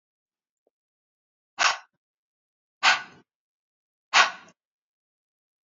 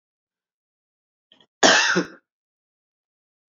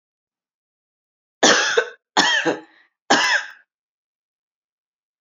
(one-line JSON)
{"exhalation_length": "5.6 s", "exhalation_amplitude": 24705, "exhalation_signal_mean_std_ratio": 0.22, "cough_length": "3.5 s", "cough_amplitude": 28880, "cough_signal_mean_std_ratio": 0.26, "three_cough_length": "5.2 s", "three_cough_amplitude": 32554, "three_cough_signal_mean_std_ratio": 0.37, "survey_phase": "beta (2021-08-13 to 2022-03-07)", "age": "18-44", "gender": "Female", "wearing_mask": "No", "symptom_none": true, "symptom_onset": "12 days", "smoker_status": "Never smoked", "respiratory_condition_asthma": false, "respiratory_condition_other": false, "recruitment_source": "REACT", "submission_delay": "1 day", "covid_test_result": "Negative", "covid_test_method": "RT-qPCR", "influenza_a_test_result": "Unknown/Void", "influenza_b_test_result": "Unknown/Void"}